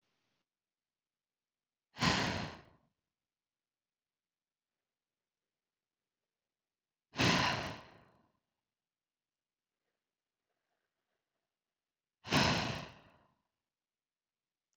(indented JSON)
{
  "exhalation_length": "14.8 s",
  "exhalation_amplitude": 5470,
  "exhalation_signal_mean_std_ratio": 0.24,
  "survey_phase": "beta (2021-08-13 to 2022-03-07)",
  "age": "18-44",
  "gender": "Female",
  "wearing_mask": "No",
  "symptom_none": true,
  "smoker_status": "Never smoked",
  "respiratory_condition_asthma": true,
  "respiratory_condition_other": false,
  "recruitment_source": "REACT",
  "submission_delay": "2 days",
  "covid_test_result": "Negative",
  "covid_test_method": "RT-qPCR",
  "influenza_a_test_result": "Unknown/Void",
  "influenza_b_test_result": "Unknown/Void"
}